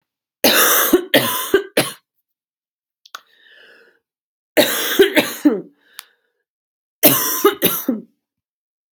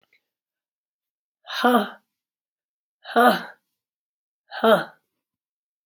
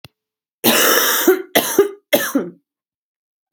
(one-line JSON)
{"three_cough_length": "8.9 s", "three_cough_amplitude": 32768, "three_cough_signal_mean_std_ratio": 0.42, "exhalation_length": "5.9 s", "exhalation_amplitude": 22791, "exhalation_signal_mean_std_ratio": 0.28, "cough_length": "3.5 s", "cough_amplitude": 32767, "cough_signal_mean_std_ratio": 0.51, "survey_phase": "beta (2021-08-13 to 2022-03-07)", "age": "18-44", "gender": "Female", "wearing_mask": "No", "symptom_cough_any": true, "symptom_sore_throat": true, "symptom_headache": true, "symptom_onset": "2 days", "smoker_status": "Never smoked", "respiratory_condition_asthma": false, "respiratory_condition_other": false, "recruitment_source": "Test and Trace", "submission_delay": "1 day", "covid_test_result": "Positive", "covid_test_method": "RT-qPCR", "covid_ct_value": 23.4, "covid_ct_gene": "ORF1ab gene"}